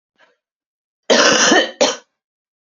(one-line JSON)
{"cough_length": "2.6 s", "cough_amplitude": 30950, "cough_signal_mean_std_ratio": 0.44, "survey_phase": "beta (2021-08-13 to 2022-03-07)", "age": "18-44", "gender": "Female", "wearing_mask": "No", "symptom_cough_any": true, "symptom_new_continuous_cough": true, "symptom_sore_throat": true, "symptom_abdominal_pain": true, "symptom_fatigue": true, "symptom_fever_high_temperature": true, "symptom_headache": true, "symptom_change_to_sense_of_smell_or_taste": true, "symptom_loss_of_taste": true, "symptom_onset": "4 days", "smoker_status": "Current smoker (1 to 10 cigarettes per day)", "respiratory_condition_asthma": false, "respiratory_condition_other": false, "recruitment_source": "Test and Trace", "submission_delay": "2 days", "covid_test_result": "Positive", "covid_test_method": "LAMP"}